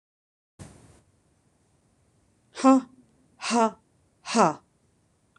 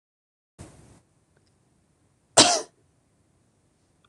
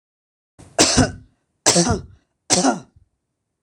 {
  "exhalation_length": "5.4 s",
  "exhalation_amplitude": 19313,
  "exhalation_signal_mean_std_ratio": 0.27,
  "cough_length": "4.1 s",
  "cough_amplitude": 26027,
  "cough_signal_mean_std_ratio": 0.18,
  "three_cough_length": "3.6 s",
  "three_cough_amplitude": 26028,
  "three_cough_signal_mean_std_ratio": 0.4,
  "survey_phase": "beta (2021-08-13 to 2022-03-07)",
  "age": "45-64",
  "gender": "Female",
  "wearing_mask": "No",
  "symptom_none": true,
  "smoker_status": "Never smoked",
  "respiratory_condition_asthma": false,
  "respiratory_condition_other": false,
  "recruitment_source": "REACT",
  "submission_delay": "2 days",
  "covid_test_result": "Negative",
  "covid_test_method": "RT-qPCR"
}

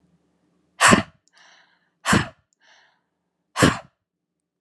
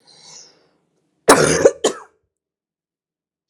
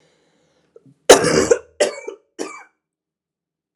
{
  "exhalation_length": "4.6 s",
  "exhalation_amplitude": 29251,
  "exhalation_signal_mean_std_ratio": 0.27,
  "cough_length": "3.5 s",
  "cough_amplitude": 32768,
  "cough_signal_mean_std_ratio": 0.28,
  "three_cough_length": "3.8 s",
  "three_cough_amplitude": 32768,
  "three_cough_signal_mean_std_ratio": 0.29,
  "survey_phase": "alpha (2021-03-01 to 2021-08-12)",
  "age": "18-44",
  "gender": "Female",
  "wearing_mask": "No",
  "symptom_cough_any": true,
  "symptom_new_continuous_cough": true,
  "symptom_fatigue": true,
  "symptom_fever_high_temperature": true,
  "symptom_headache": true,
  "symptom_change_to_sense_of_smell_or_taste": true,
  "symptom_onset": "4 days",
  "smoker_status": "Ex-smoker",
  "respiratory_condition_asthma": false,
  "respiratory_condition_other": false,
  "recruitment_source": "Test and Trace",
  "submission_delay": "1 day",
  "covid_test_result": "Positive",
  "covid_test_method": "RT-qPCR",
  "covid_ct_value": 14.7,
  "covid_ct_gene": "ORF1ab gene",
  "covid_ct_mean": 15.1,
  "covid_viral_load": "11000000 copies/ml",
  "covid_viral_load_category": "High viral load (>1M copies/ml)"
}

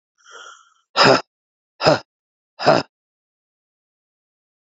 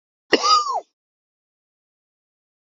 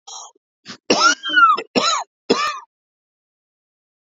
{
  "exhalation_length": "4.6 s",
  "exhalation_amplitude": 32767,
  "exhalation_signal_mean_std_ratio": 0.28,
  "cough_length": "2.7 s",
  "cough_amplitude": 30527,
  "cough_signal_mean_std_ratio": 0.3,
  "three_cough_length": "4.0 s",
  "three_cough_amplitude": 28978,
  "three_cough_signal_mean_std_ratio": 0.43,
  "survey_phase": "beta (2021-08-13 to 2022-03-07)",
  "age": "45-64",
  "gender": "Male",
  "wearing_mask": "No",
  "symptom_cough_any": true,
  "symptom_runny_or_blocked_nose": true,
  "symptom_headache": true,
  "symptom_onset": "9 days",
  "smoker_status": "Never smoked",
  "respiratory_condition_asthma": false,
  "respiratory_condition_other": false,
  "recruitment_source": "Test and Trace",
  "submission_delay": "1 day",
  "covid_test_result": "Positive",
  "covid_test_method": "RT-qPCR"
}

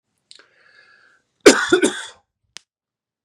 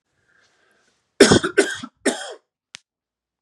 {
  "cough_length": "3.2 s",
  "cough_amplitude": 32768,
  "cough_signal_mean_std_ratio": 0.25,
  "three_cough_length": "3.4 s",
  "three_cough_amplitude": 32768,
  "three_cough_signal_mean_std_ratio": 0.28,
  "survey_phase": "beta (2021-08-13 to 2022-03-07)",
  "age": "18-44",
  "gender": "Male",
  "wearing_mask": "No",
  "symptom_cough_any": true,
  "symptom_runny_or_blocked_nose": true,
  "symptom_headache": true,
  "symptom_change_to_sense_of_smell_or_taste": true,
  "symptom_onset": "7 days",
  "smoker_status": "Never smoked",
  "respiratory_condition_asthma": false,
  "respiratory_condition_other": false,
  "recruitment_source": "Test and Trace",
  "submission_delay": "1 day",
  "covid_test_result": "Positive",
  "covid_test_method": "RT-qPCR",
  "covid_ct_value": 17.8,
  "covid_ct_gene": "N gene"
}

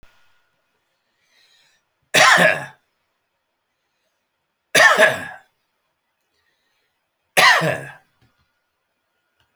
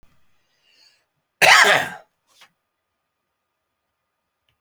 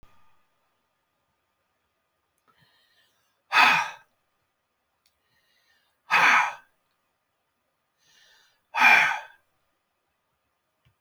{
  "three_cough_length": "9.6 s",
  "three_cough_amplitude": 30326,
  "three_cough_signal_mean_std_ratio": 0.29,
  "cough_length": "4.6 s",
  "cough_amplitude": 31402,
  "cough_signal_mean_std_ratio": 0.24,
  "exhalation_length": "11.0 s",
  "exhalation_amplitude": 21475,
  "exhalation_signal_mean_std_ratio": 0.26,
  "survey_phase": "alpha (2021-03-01 to 2021-08-12)",
  "age": "65+",
  "gender": "Male",
  "wearing_mask": "No",
  "symptom_cough_any": true,
  "smoker_status": "Ex-smoker",
  "respiratory_condition_asthma": false,
  "respiratory_condition_other": false,
  "recruitment_source": "REACT",
  "submission_delay": "2 days",
  "covid_test_result": "Negative",
  "covid_test_method": "RT-qPCR"
}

